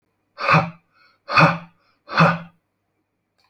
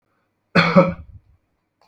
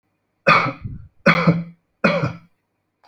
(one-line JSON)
{"exhalation_length": "3.5 s", "exhalation_amplitude": 30349, "exhalation_signal_mean_std_ratio": 0.36, "cough_length": "1.9 s", "cough_amplitude": 27497, "cough_signal_mean_std_ratio": 0.34, "three_cough_length": "3.1 s", "three_cough_amplitude": 28489, "three_cough_signal_mean_std_ratio": 0.43, "survey_phase": "beta (2021-08-13 to 2022-03-07)", "age": "65+", "gender": "Male", "wearing_mask": "No", "symptom_none": true, "smoker_status": "Ex-smoker", "respiratory_condition_asthma": false, "respiratory_condition_other": false, "recruitment_source": "REACT", "submission_delay": "1 day", "covid_test_result": "Negative", "covid_test_method": "RT-qPCR"}